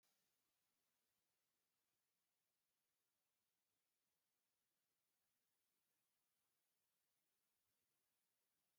three_cough_length: 8.8 s
three_cough_amplitude: 9
three_cough_signal_mean_std_ratio: 0.72
survey_phase: beta (2021-08-13 to 2022-03-07)
age: 45-64
gender: Male
wearing_mask: 'No'
symptom_none: true
smoker_status: Never smoked
respiratory_condition_asthma: false
respiratory_condition_other: false
recruitment_source: REACT
submission_delay: 1 day
covid_test_result: Negative
covid_test_method: RT-qPCR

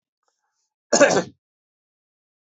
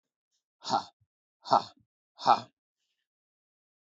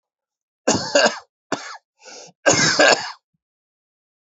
cough_length: 2.5 s
cough_amplitude: 27669
cough_signal_mean_std_ratio: 0.25
exhalation_length: 3.8 s
exhalation_amplitude: 12987
exhalation_signal_mean_std_ratio: 0.22
three_cough_length: 4.3 s
three_cough_amplitude: 32767
three_cough_signal_mean_std_ratio: 0.39
survey_phase: beta (2021-08-13 to 2022-03-07)
age: 45-64
gender: Male
wearing_mask: 'No'
symptom_cough_any: true
symptom_runny_or_blocked_nose: true
symptom_fatigue: true
symptom_headache: true
smoker_status: Never smoked
respiratory_condition_asthma: false
respiratory_condition_other: false
recruitment_source: Test and Trace
submission_delay: 2 days
covid_test_result: Positive
covid_test_method: RT-qPCR
covid_ct_value: 20.4
covid_ct_gene: N gene
covid_ct_mean: 21.0
covid_viral_load: 130000 copies/ml
covid_viral_load_category: Low viral load (10K-1M copies/ml)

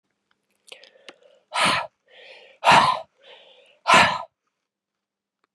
exhalation_length: 5.5 s
exhalation_amplitude: 27041
exhalation_signal_mean_std_ratio: 0.32
survey_phase: beta (2021-08-13 to 2022-03-07)
age: 45-64
gender: Female
wearing_mask: 'No'
symptom_new_continuous_cough: true
symptom_runny_or_blocked_nose: true
symptom_sore_throat: true
symptom_diarrhoea: true
symptom_fatigue: true
symptom_fever_high_temperature: true
symptom_headache: true
symptom_change_to_sense_of_smell_or_taste: true
symptom_onset: 6 days
smoker_status: Never smoked
respiratory_condition_asthma: false
respiratory_condition_other: false
recruitment_source: Test and Trace
submission_delay: 2 days
covid_test_result: Positive
covid_test_method: RT-qPCR
covid_ct_value: 13.9
covid_ct_gene: ORF1ab gene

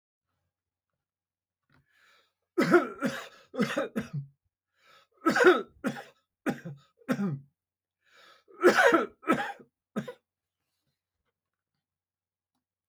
three_cough_length: 12.9 s
three_cough_amplitude: 13435
three_cough_signal_mean_std_ratio: 0.32
survey_phase: beta (2021-08-13 to 2022-03-07)
age: 65+
gender: Male
wearing_mask: 'No'
symptom_none: true
smoker_status: Never smoked
respiratory_condition_asthma: false
respiratory_condition_other: false
recruitment_source: REACT
submission_delay: 9 days
covid_test_result: Negative
covid_test_method: RT-qPCR
influenza_a_test_result: Negative
influenza_b_test_result: Negative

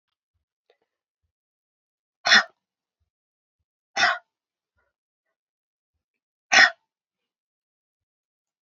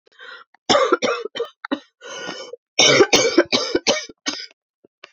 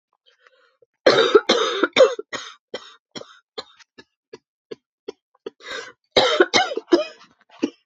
exhalation_length: 8.6 s
exhalation_amplitude: 28308
exhalation_signal_mean_std_ratio: 0.18
three_cough_length: 5.1 s
three_cough_amplitude: 30502
three_cough_signal_mean_std_ratio: 0.47
cough_length: 7.9 s
cough_amplitude: 28700
cough_signal_mean_std_ratio: 0.35
survey_phase: beta (2021-08-13 to 2022-03-07)
age: 18-44
gender: Female
wearing_mask: 'No'
symptom_cough_any: true
symptom_runny_or_blocked_nose: true
symptom_sore_throat: true
symptom_fatigue: true
symptom_change_to_sense_of_smell_or_taste: true
symptom_onset: 3 days
smoker_status: Never smoked
respiratory_condition_asthma: false
respiratory_condition_other: false
recruitment_source: Test and Trace
submission_delay: 1 day
covid_test_result: Positive
covid_test_method: RT-qPCR
covid_ct_value: 16.0
covid_ct_gene: N gene
covid_ct_mean: 17.5
covid_viral_load: 1800000 copies/ml
covid_viral_load_category: High viral load (>1M copies/ml)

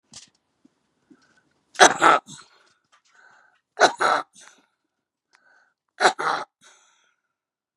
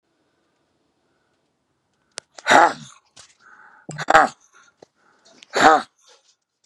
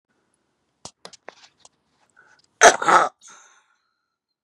three_cough_length: 7.8 s
three_cough_amplitude: 32767
three_cough_signal_mean_std_ratio: 0.25
exhalation_length: 6.7 s
exhalation_amplitude: 32767
exhalation_signal_mean_std_ratio: 0.25
cough_length: 4.4 s
cough_amplitude: 32768
cough_signal_mean_std_ratio: 0.21
survey_phase: beta (2021-08-13 to 2022-03-07)
age: 65+
gender: Male
wearing_mask: 'No'
symptom_shortness_of_breath: true
symptom_onset: 6 days
smoker_status: Ex-smoker
respiratory_condition_asthma: true
respiratory_condition_other: true
recruitment_source: REACT
submission_delay: 1 day
covid_test_result: Negative
covid_test_method: RT-qPCR
influenza_a_test_result: Negative
influenza_b_test_result: Negative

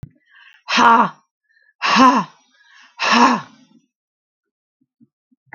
exhalation_length: 5.5 s
exhalation_amplitude: 32767
exhalation_signal_mean_std_ratio: 0.38
survey_phase: beta (2021-08-13 to 2022-03-07)
age: 45-64
gender: Female
wearing_mask: 'No'
symptom_none: true
smoker_status: Never smoked
respiratory_condition_asthma: false
respiratory_condition_other: false
recruitment_source: REACT
submission_delay: 2 days
covid_test_result: Negative
covid_test_method: RT-qPCR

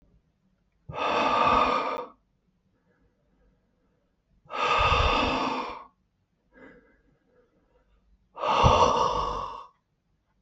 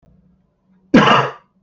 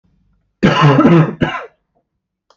exhalation_length: 10.4 s
exhalation_amplitude: 17040
exhalation_signal_mean_std_ratio: 0.47
cough_length: 1.6 s
cough_amplitude: 32768
cough_signal_mean_std_ratio: 0.38
three_cough_length: 2.6 s
three_cough_amplitude: 32768
three_cough_signal_mean_std_ratio: 0.48
survey_phase: beta (2021-08-13 to 2022-03-07)
age: 18-44
gender: Male
wearing_mask: 'No'
symptom_none: true
symptom_onset: 12 days
smoker_status: Never smoked
respiratory_condition_asthma: true
respiratory_condition_other: false
recruitment_source: REACT
submission_delay: 0 days
covid_test_result: Negative
covid_test_method: RT-qPCR
covid_ct_value: 38.8
covid_ct_gene: N gene
influenza_a_test_result: Negative
influenza_b_test_result: Negative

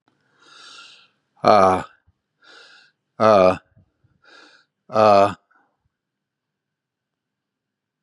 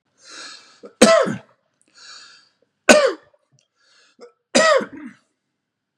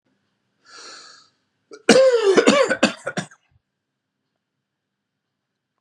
exhalation_length: 8.0 s
exhalation_amplitude: 32767
exhalation_signal_mean_std_ratio: 0.29
three_cough_length: 6.0 s
three_cough_amplitude: 32768
three_cough_signal_mean_std_ratio: 0.31
cough_length: 5.8 s
cough_amplitude: 32600
cough_signal_mean_std_ratio: 0.34
survey_phase: beta (2021-08-13 to 2022-03-07)
age: 45-64
gender: Male
wearing_mask: 'No'
symptom_cough_any: true
symptom_sore_throat: true
smoker_status: Never smoked
respiratory_condition_asthma: false
respiratory_condition_other: false
recruitment_source: Test and Trace
submission_delay: 2 days
covid_test_result: Positive
covid_test_method: LFT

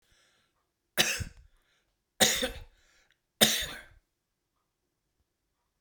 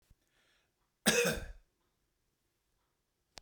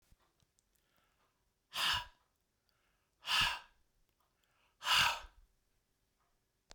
three_cough_length: 5.8 s
three_cough_amplitude: 22364
three_cough_signal_mean_std_ratio: 0.27
cough_length: 3.4 s
cough_amplitude: 7970
cough_signal_mean_std_ratio: 0.26
exhalation_length: 6.7 s
exhalation_amplitude: 4561
exhalation_signal_mean_std_ratio: 0.3
survey_phase: beta (2021-08-13 to 2022-03-07)
age: 45-64
gender: Male
wearing_mask: 'No'
symptom_none: true
smoker_status: Ex-smoker
respiratory_condition_asthma: false
respiratory_condition_other: false
recruitment_source: REACT
submission_delay: 1 day
covid_test_result: Negative
covid_test_method: RT-qPCR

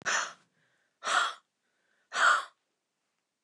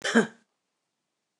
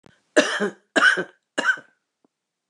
exhalation_length: 3.4 s
exhalation_amplitude: 7472
exhalation_signal_mean_std_ratio: 0.38
cough_length: 1.4 s
cough_amplitude: 16895
cough_signal_mean_std_ratio: 0.27
three_cough_length: 2.7 s
three_cough_amplitude: 28148
three_cough_signal_mean_std_ratio: 0.39
survey_phase: beta (2021-08-13 to 2022-03-07)
age: 65+
gender: Female
wearing_mask: 'No'
symptom_none: true
smoker_status: Ex-smoker
respiratory_condition_asthma: false
respiratory_condition_other: false
recruitment_source: REACT
submission_delay: 1 day
covid_test_result: Negative
covid_test_method: RT-qPCR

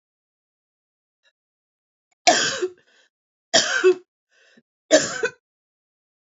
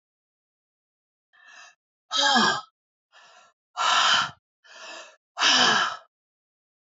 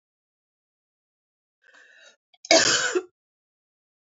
three_cough_length: 6.3 s
three_cough_amplitude: 30016
three_cough_signal_mean_std_ratio: 0.3
exhalation_length: 6.8 s
exhalation_amplitude: 15236
exhalation_signal_mean_std_ratio: 0.41
cough_length: 4.0 s
cough_amplitude: 32736
cough_signal_mean_std_ratio: 0.26
survey_phase: beta (2021-08-13 to 2022-03-07)
age: 45-64
gender: Female
wearing_mask: 'No'
symptom_none: true
symptom_onset: 5 days
smoker_status: Never smoked
respiratory_condition_asthma: false
respiratory_condition_other: false
recruitment_source: REACT
submission_delay: 2 days
covid_test_result: Positive
covid_test_method: RT-qPCR
covid_ct_value: 18.0
covid_ct_gene: E gene
influenza_a_test_result: Negative
influenza_b_test_result: Negative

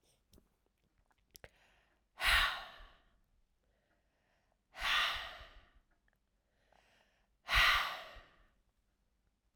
exhalation_length: 9.6 s
exhalation_amplitude: 4688
exhalation_signal_mean_std_ratio: 0.31
survey_phase: alpha (2021-03-01 to 2021-08-12)
age: 18-44
gender: Female
wearing_mask: 'No'
symptom_cough_any: true
symptom_diarrhoea: true
symptom_fatigue: true
symptom_headache: true
symptom_change_to_sense_of_smell_or_taste: true
smoker_status: Never smoked
respiratory_condition_asthma: true
respiratory_condition_other: false
recruitment_source: Test and Trace
submission_delay: 2 days
covid_test_result: Positive
covid_test_method: RT-qPCR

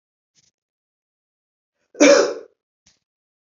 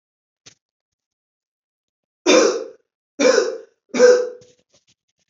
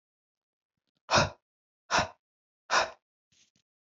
cough_length: 3.6 s
cough_amplitude: 28228
cough_signal_mean_std_ratio: 0.24
three_cough_length: 5.3 s
three_cough_amplitude: 27761
three_cough_signal_mean_std_ratio: 0.35
exhalation_length: 3.8 s
exhalation_amplitude: 11444
exhalation_signal_mean_std_ratio: 0.28
survey_phase: beta (2021-08-13 to 2022-03-07)
age: 45-64
gender: Female
wearing_mask: 'No'
symptom_cough_any: true
symptom_runny_or_blocked_nose: true
symptom_sore_throat: true
symptom_fatigue: true
symptom_onset: 3 days
smoker_status: Ex-smoker
respiratory_condition_asthma: false
respiratory_condition_other: false
recruitment_source: Test and Trace
submission_delay: 2 days
covid_test_result: Positive
covid_test_method: ePCR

